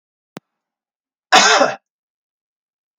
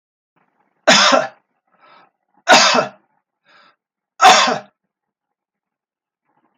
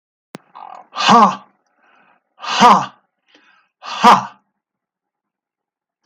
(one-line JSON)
{"cough_length": "3.0 s", "cough_amplitude": 32768, "cough_signal_mean_std_ratio": 0.29, "three_cough_length": "6.6 s", "three_cough_amplitude": 32768, "three_cough_signal_mean_std_ratio": 0.33, "exhalation_length": "6.1 s", "exhalation_amplitude": 32768, "exhalation_signal_mean_std_ratio": 0.32, "survey_phase": "beta (2021-08-13 to 2022-03-07)", "age": "65+", "gender": "Male", "wearing_mask": "No", "symptom_none": true, "smoker_status": "Ex-smoker", "respiratory_condition_asthma": false, "respiratory_condition_other": false, "recruitment_source": "REACT", "submission_delay": "3 days", "covid_test_result": "Negative", "covid_test_method": "RT-qPCR", "influenza_a_test_result": "Negative", "influenza_b_test_result": "Negative"}